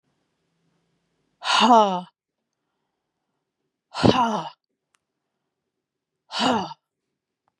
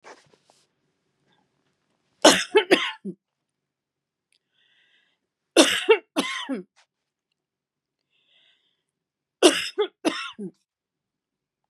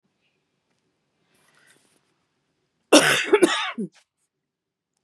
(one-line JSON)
{"exhalation_length": "7.6 s", "exhalation_amplitude": 29289, "exhalation_signal_mean_std_ratio": 0.3, "three_cough_length": "11.7 s", "three_cough_amplitude": 32348, "three_cough_signal_mean_std_ratio": 0.25, "cough_length": "5.0 s", "cough_amplitude": 30718, "cough_signal_mean_std_ratio": 0.27, "survey_phase": "beta (2021-08-13 to 2022-03-07)", "age": "45-64", "gender": "Female", "wearing_mask": "No", "symptom_none": true, "smoker_status": "Never smoked", "respiratory_condition_asthma": false, "respiratory_condition_other": false, "recruitment_source": "REACT", "submission_delay": "2 days", "covid_test_result": "Negative", "covid_test_method": "RT-qPCR"}